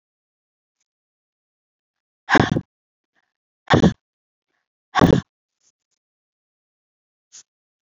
{"exhalation_length": "7.9 s", "exhalation_amplitude": 32767, "exhalation_signal_mean_std_ratio": 0.21, "survey_phase": "beta (2021-08-13 to 2022-03-07)", "age": "45-64", "gender": "Female", "wearing_mask": "No", "symptom_cough_any": true, "symptom_runny_or_blocked_nose": true, "symptom_sore_throat": true, "smoker_status": "Current smoker (1 to 10 cigarettes per day)", "respiratory_condition_asthma": false, "respiratory_condition_other": false, "recruitment_source": "Test and Trace", "submission_delay": "2 days", "covid_test_result": "Positive", "covid_test_method": "RT-qPCR", "covid_ct_value": 22.0, "covid_ct_gene": "ORF1ab gene", "covid_ct_mean": 22.5, "covid_viral_load": "41000 copies/ml", "covid_viral_load_category": "Low viral load (10K-1M copies/ml)"}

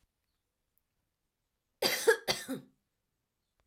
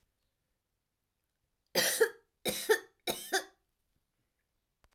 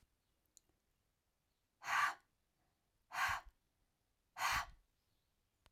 {"cough_length": "3.7 s", "cough_amplitude": 7241, "cough_signal_mean_std_ratio": 0.26, "three_cough_length": "4.9 s", "three_cough_amplitude": 5965, "three_cough_signal_mean_std_ratio": 0.3, "exhalation_length": "5.7 s", "exhalation_amplitude": 2029, "exhalation_signal_mean_std_ratio": 0.31, "survey_phase": "alpha (2021-03-01 to 2021-08-12)", "age": "18-44", "gender": "Female", "wearing_mask": "No", "symptom_none": true, "smoker_status": "Ex-smoker", "respiratory_condition_asthma": false, "respiratory_condition_other": false, "recruitment_source": "REACT", "submission_delay": "1 day", "covid_test_result": "Negative", "covid_test_method": "RT-qPCR"}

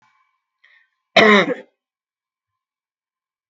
{"cough_length": "3.5 s", "cough_amplitude": 32768, "cough_signal_mean_std_ratio": 0.25, "survey_phase": "beta (2021-08-13 to 2022-03-07)", "age": "65+", "gender": "Female", "wearing_mask": "No", "symptom_none": true, "smoker_status": "Ex-smoker", "respiratory_condition_asthma": false, "respiratory_condition_other": false, "recruitment_source": "Test and Trace", "submission_delay": "1 day", "covid_test_result": "Negative", "covid_test_method": "RT-qPCR"}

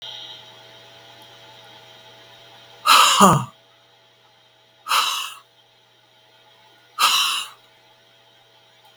{"exhalation_length": "9.0 s", "exhalation_amplitude": 32768, "exhalation_signal_mean_std_ratio": 0.33, "survey_phase": "beta (2021-08-13 to 2022-03-07)", "age": "65+", "gender": "Female", "wearing_mask": "No", "symptom_none": true, "smoker_status": "Ex-smoker", "respiratory_condition_asthma": false, "respiratory_condition_other": false, "recruitment_source": "REACT", "submission_delay": "2 days", "covid_test_result": "Negative", "covid_test_method": "RT-qPCR"}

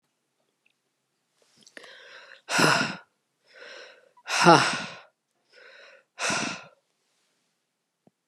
{"exhalation_length": "8.3 s", "exhalation_amplitude": 29793, "exhalation_signal_mean_std_ratio": 0.29, "survey_phase": "beta (2021-08-13 to 2022-03-07)", "age": "45-64", "gender": "Female", "wearing_mask": "No", "symptom_none": true, "smoker_status": "Never smoked", "respiratory_condition_asthma": false, "respiratory_condition_other": false, "recruitment_source": "REACT", "submission_delay": "1 day", "covid_test_result": "Negative", "covid_test_method": "RT-qPCR", "influenza_a_test_result": "Negative", "influenza_b_test_result": "Negative"}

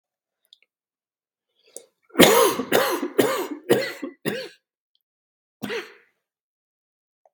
{"cough_length": "7.3 s", "cough_amplitude": 32768, "cough_signal_mean_std_ratio": 0.34, "survey_phase": "beta (2021-08-13 to 2022-03-07)", "age": "45-64", "gender": "Male", "wearing_mask": "No", "symptom_cough_any": true, "symptom_new_continuous_cough": true, "symptom_runny_or_blocked_nose": true, "symptom_fatigue": true, "symptom_fever_high_temperature": true, "symptom_headache": true, "symptom_change_to_sense_of_smell_or_taste": true, "symptom_loss_of_taste": true, "symptom_onset": "6 days", "smoker_status": "Never smoked", "respiratory_condition_asthma": false, "respiratory_condition_other": false, "recruitment_source": "Test and Trace", "submission_delay": "2 days", "covid_test_result": "Positive", "covid_test_method": "RT-qPCR", "covid_ct_value": 15.9, "covid_ct_gene": "S gene", "covid_ct_mean": 16.1, "covid_viral_load": "5200000 copies/ml", "covid_viral_load_category": "High viral load (>1M copies/ml)"}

